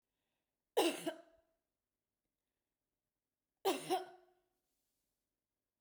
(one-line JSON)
{"cough_length": "5.8 s", "cough_amplitude": 2866, "cough_signal_mean_std_ratio": 0.25, "survey_phase": "beta (2021-08-13 to 2022-03-07)", "age": "45-64", "gender": "Female", "wearing_mask": "No", "symptom_none": true, "smoker_status": "Ex-smoker", "respiratory_condition_asthma": false, "respiratory_condition_other": false, "recruitment_source": "REACT", "submission_delay": "2 days", "covid_test_result": "Negative", "covid_test_method": "RT-qPCR", "influenza_a_test_result": "Negative", "influenza_b_test_result": "Negative"}